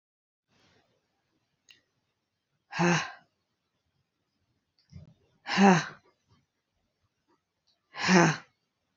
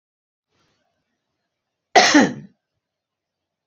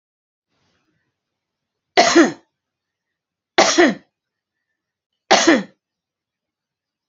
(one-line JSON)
{"exhalation_length": "9.0 s", "exhalation_amplitude": 18351, "exhalation_signal_mean_std_ratio": 0.25, "cough_length": "3.7 s", "cough_amplitude": 27974, "cough_signal_mean_std_ratio": 0.24, "three_cough_length": "7.1 s", "three_cough_amplitude": 31845, "three_cough_signal_mean_std_ratio": 0.29, "survey_phase": "beta (2021-08-13 to 2022-03-07)", "age": "45-64", "gender": "Female", "wearing_mask": "No", "symptom_cough_any": true, "symptom_onset": "12 days", "smoker_status": "Never smoked", "respiratory_condition_asthma": false, "respiratory_condition_other": false, "recruitment_source": "REACT", "submission_delay": "6 days", "covid_test_result": "Negative", "covid_test_method": "RT-qPCR"}